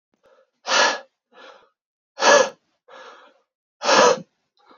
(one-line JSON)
{"exhalation_length": "4.8 s", "exhalation_amplitude": 26960, "exhalation_signal_mean_std_ratio": 0.35, "survey_phase": "beta (2021-08-13 to 2022-03-07)", "age": "18-44", "gender": "Male", "wearing_mask": "No", "symptom_change_to_sense_of_smell_or_taste": true, "symptom_loss_of_taste": true, "symptom_onset": "3 days", "smoker_status": "Never smoked", "respiratory_condition_asthma": false, "respiratory_condition_other": false, "recruitment_source": "Test and Trace", "submission_delay": "2 days", "covid_test_result": "Positive", "covid_test_method": "RT-qPCR", "covid_ct_value": 18.4, "covid_ct_gene": "ORF1ab gene"}